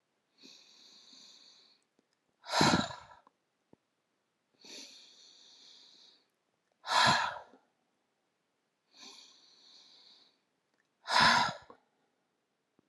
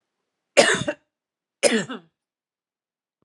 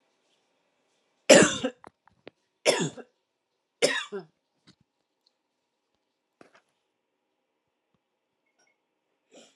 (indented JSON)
{
  "exhalation_length": "12.9 s",
  "exhalation_amplitude": 9707,
  "exhalation_signal_mean_std_ratio": 0.27,
  "cough_length": "3.2 s",
  "cough_amplitude": 29841,
  "cough_signal_mean_std_ratio": 0.29,
  "three_cough_length": "9.6 s",
  "three_cough_amplitude": 28800,
  "three_cough_signal_mean_std_ratio": 0.19,
  "survey_phase": "alpha (2021-03-01 to 2021-08-12)",
  "age": "45-64",
  "gender": "Female",
  "wearing_mask": "No",
  "symptom_none": true,
  "smoker_status": "Never smoked",
  "respiratory_condition_asthma": false,
  "respiratory_condition_other": false,
  "recruitment_source": "Test and Trace",
  "submission_delay": "0 days",
  "covid_test_result": "Negative",
  "covid_test_method": "LFT"
}